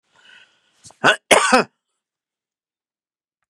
{
  "cough_length": "3.5 s",
  "cough_amplitude": 32768,
  "cough_signal_mean_std_ratio": 0.26,
  "survey_phase": "beta (2021-08-13 to 2022-03-07)",
  "age": "65+",
  "gender": "Male",
  "wearing_mask": "No",
  "symptom_none": true,
  "smoker_status": "Ex-smoker",
  "respiratory_condition_asthma": false,
  "respiratory_condition_other": false,
  "recruitment_source": "REACT",
  "submission_delay": "4 days",
  "covid_test_result": "Negative",
  "covid_test_method": "RT-qPCR",
  "influenza_a_test_result": "Negative",
  "influenza_b_test_result": "Negative"
}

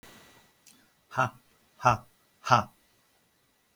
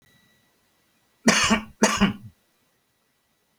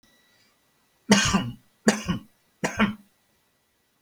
{
  "exhalation_length": "3.8 s",
  "exhalation_amplitude": 17510,
  "exhalation_signal_mean_std_ratio": 0.25,
  "cough_length": "3.6 s",
  "cough_amplitude": 27077,
  "cough_signal_mean_std_ratio": 0.34,
  "three_cough_length": "4.0 s",
  "three_cough_amplitude": 24800,
  "three_cough_signal_mean_std_ratio": 0.35,
  "survey_phase": "alpha (2021-03-01 to 2021-08-12)",
  "age": "65+",
  "gender": "Male",
  "wearing_mask": "No",
  "symptom_none": true,
  "smoker_status": "Ex-smoker",
  "respiratory_condition_asthma": false,
  "respiratory_condition_other": false,
  "recruitment_source": "REACT",
  "submission_delay": "2 days",
  "covid_test_result": "Negative",
  "covid_test_method": "RT-qPCR"
}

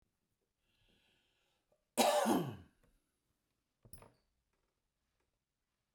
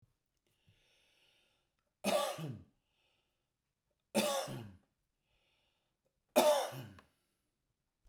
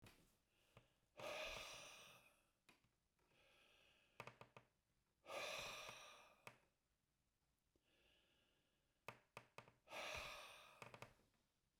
{
  "cough_length": "5.9 s",
  "cough_amplitude": 4465,
  "cough_signal_mean_std_ratio": 0.25,
  "three_cough_length": "8.1 s",
  "three_cough_amplitude": 7302,
  "three_cough_signal_mean_std_ratio": 0.3,
  "exhalation_length": "11.8 s",
  "exhalation_amplitude": 410,
  "exhalation_signal_mean_std_ratio": 0.46,
  "survey_phase": "beta (2021-08-13 to 2022-03-07)",
  "age": "65+",
  "gender": "Male",
  "wearing_mask": "No",
  "symptom_none": true,
  "smoker_status": "Ex-smoker",
  "respiratory_condition_asthma": false,
  "respiratory_condition_other": false,
  "recruitment_source": "REACT",
  "submission_delay": "1 day",
  "covid_test_result": "Negative",
  "covid_test_method": "RT-qPCR",
  "influenza_a_test_result": "Negative",
  "influenza_b_test_result": "Negative"
}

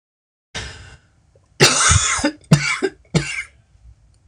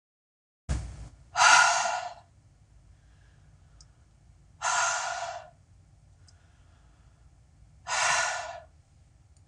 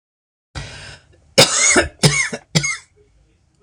{
  "cough_length": "4.3 s",
  "cough_amplitude": 26028,
  "cough_signal_mean_std_ratio": 0.43,
  "exhalation_length": "9.5 s",
  "exhalation_amplitude": 19253,
  "exhalation_signal_mean_std_ratio": 0.38,
  "three_cough_length": "3.6 s",
  "three_cough_amplitude": 26028,
  "three_cough_signal_mean_std_ratio": 0.42,
  "survey_phase": "beta (2021-08-13 to 2022-03-07)",
  "age": "45-64",
  "gender": "Female",
  "wearing_mask": "No",
  "symptom_none": true,
  "smoker_status": "Never smoked",
  "respiratory_condition_asthma": false,
  "respiratory_condition_other": false,
  "recruitment_source": "REACT",
  "submission_delay": "4 days",
  "covid_test_result": "Negative",
  "covid_test_method": "RT-qPCR",
  "influenza_a_test_result": "Negative",
  "influenza_b_test_result": "Negative"
}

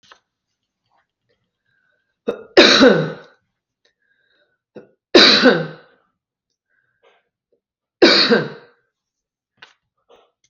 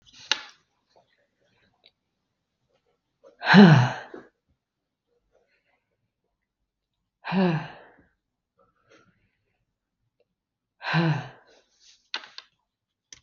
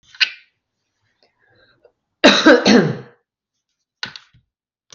{
  "three_cough_length": "10.5 s",
  "three_cough_amplitude": 32768,
  "three_cough_signal_mean_std_ratio": 0.29,
  "exhalation_length": "13.2 s",
  "exhalation_amplitude": 32766,
  "exhalation_signal_mean_std_ratio": 0.22,
  "cough_length": "4.9 s",
  "cough_amplitude": 32768,
  "cough_signal_mean_std_ratio": 0.3,
  "survey_phase": "beta (2021-08-13 to 2022-03-07)",
  "age": "45-64",
  "gender": "Female",
  "wearing_mask": "No",
  "symptom_none": true,
  "smoker_status": "Ex-smoker",
  "respiratory_condition_asthma": false,
  "respiratory_condition_other": false,
  "recruitment_source": "REACT",
  "submission_delay": "2 days",
  "covid_test_result": "Negative",
  "covid_test_method": "RT-qPCR",
  "influenza_a_test_result": "Negative",
  "influenza_b_test_result": "Negative"
}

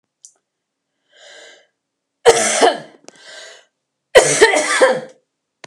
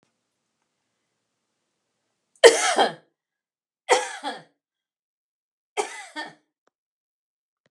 {
  "cough_length": "5.7 s",
  "cough_amplitude": 32768,
  "cough_signal_mean_std_ratio": 0.37,
  "three_cough_length": "7.7 s",
  "three_cough_amplitude": 32767,
  "three_cough_signal_mean_std_ratio": 0.21,
  "survey_phase": "beta (2021-08-13 to 2022-03-07)",
  "age": "45-64",
  "gender": "Female",
  "wearing_mask": "No",
  "symptom_runny_or_blocked_nose": true,
  "symptom_shortness_of_breath": true,
  "symptom_abdominal_pain": true,
  "symptom_diarrhoea": true,
  "symptom_fatigue": true,
  "symptom_headache": true,
  "symptom_onset": "13 days",
  "smoker_status": "Ex-smoker",
  "respiratory_condition_asthma": false,
  "respiratory_condition_other": true,
  "recruitment_source": "REACT",
  "submission_delay": "1 day",
  "covid_test_result": "Negative",
  "covid_test_method": "RT-qPCR"
}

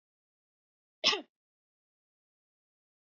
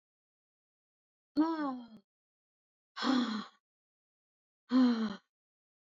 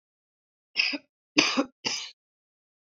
{
  "cough_length": "3.1 s",
  "cough_amplitude": 6971,
  "cough_signal_mean_std_ratio": 0.16,
  "exhalation_length": "5.8 s",
  "exhalation_amplitude": 3931,
  "exhalation_signal_mean_std_ratio": 0.38,
  "three_cough_length": "3.0 s",
  "three_cough_amplitude": 28060,
  "three_cough_signal_mean_std_ratio": 0.33,
  "survey_phase": "beta (2021-08-13 to 2022-03-07)",
  "age": "65+",
  "gender": "Female",
  "wearing_mask": "No",
  "symptom_none": true,
  "smoker_status": "Never smoked",
  "respiratory_condition_asthma": false,
  "respiratory_condition_other": false,
  "recruitment_source": "REACT",
  "submission_delay": "1 day",
  "covid_test_result": "Negative",
  "covid_test_method": "RT-qPCR",
  "influenza_a_test_result": "Negative",
  "influenza_b_test_result": "Negative"
}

